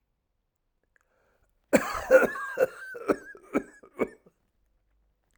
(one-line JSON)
{"cough_length": "5.4 s", "cough_amplitude": 18998, "cough_signal_mean_std_ratio": 0.3, "survey_phase": "alpha (2021-03-01 to 2021-08-12)", "age": "65+", "gender": "Male", "wearing_mask": "No", "symptom_abdominal_pain": true, "symptom_fatigue": true, "symptom_fever_high_temperature": true, "symptom_headache": true, "symptom_change_to_sense_of_smell_or_taste": true, "symptom_onset": "3 days", "smoker_status": "Never smoked", "respiratory_condition_asthma": false, "respiratory_condition_other": false, "recruitment_source": "Test and Trace", "submission_delay": "1 day", "covid_test_result": "Positive", "covid_test_method": "RT-qPCR", "covid_ct_value": 18.0, "covid_ct_gene": "N gene", "covid_ct_mean": 18.4, "covid_viral_load": "930000 copies/ml", "covid_viral_load_category": "Low viral load (10K-1M copies/ml)"}